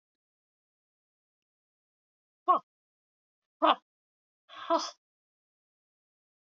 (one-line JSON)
{"exhalation_length": "6.5 s", "exhalation_amplitude": 11942, "exhalation_signal_mean_std_ratio": 0.19, "survey_phase": "alpha (2021-03-01 to 2021-08-12)", "age": "65+", "gender": "Female", "wearing_mask": "No", "symptom_cough_any": true, "smoker_status": "Never smoked", "respiratory_condition_asthma": false, "respiratory_condition_other": false, "recruitment_source": "REACT", "submission_delay": "2 days", "covid_test_result": "Negative", "covid_test_method": "RT-qPCR"}